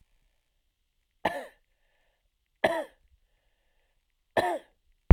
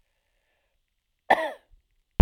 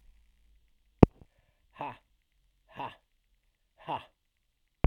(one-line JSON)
{"three_cough_length": "5.1 s", "three_cough_amplitude": 29075, "three_cough_signal_mean_std_ratio": 0.17, "cough_length": "2.2 s", "cough_amplitude": 32768, "cough_signal_mean_std_ratio": 0.16, "exhalation_length": "4.9 s", "exhalation_amplitude": 32768, "exhalation_signal_mean_std_ratio": 0.12, "survey_phase": "beta (2021-08-13 to 2022-03-07)", "age": "45-64", "gender": "Male", "wearing_mask": "No", "symptom_runny_or_blocked_nose": true, "symptom_onset": "3 days", "smoker_status": "Never smoked", "respiratory_condition_asthma": false, "respiratory_condition_other": false, "recruitment_source": "Test and Trace", "submission_delay": "1 day", "covid_test_result": "Positive", "covid_test_method": "ePCR"}